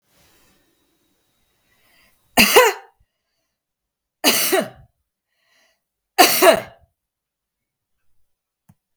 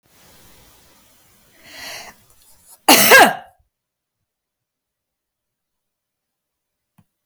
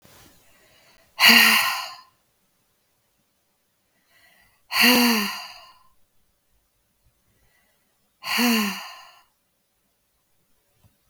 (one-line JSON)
{"three_cough_length": "9.0 s", "three_cough_amplitude": 32768, "three_cough_signal_mean_std_ratio": 0.27, "cough_length": "7.3 s", "cough_amplitude": 32768, "cough_signal_mean_std_ratio": 0.22, "exhalation_length": "11.1 s", "exhalation_amplitude": 32767, "exhalation_signal_mean_std_ratio": 0.31, "survey_phase": "beta (2021-08-13 to 2022-03-07)", "age": "45-64", "gender": "Female", "wearing_mask": "No", "symptom_none": true, "smoker_status": "Never smoked", "respiratory_condition_asthma": false, "respiratory_condition_other": false, "recruitment_source": "REACT", "submission_delay": "1 day", "covid_test_result": "Negative", "covid_test_method": "RT-qPCR", "influenza_a_test_result": "Negative", "influenza_b_test_result": "Negative"}